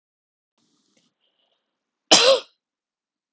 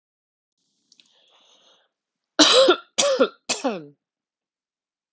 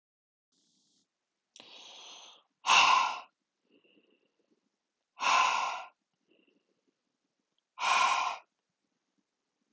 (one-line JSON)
{"cough_length": "3.3 s", "cough_amplitude": 32766, "cough_signal_mean_std_ratio": 0.23, "three_cough_length": "5.1 s", "three_cough_amplitude": 32766, "three_cough_signal_mean_std_ratio": 0.32, "exhalation_length": "9.7 s", "exhalation_amplitude": 9279, "exhalation_signal_mean_std_ratio": 0.33, "survey_phase": "beta (2021-08-13 to 2022-03-07)", "age": "45-64", "gender": "Female", "wearing_mask": "No", "symptom_none": true, "smoker_status": "Never smoked", "respiratory_condition_asthma": false, "respiratory_condition_other": false, "recruitment_source": "REACT", "submission_delay": "4 days", "covid_test_result": "Negative", "covid_test_method": "RT-qPCR"}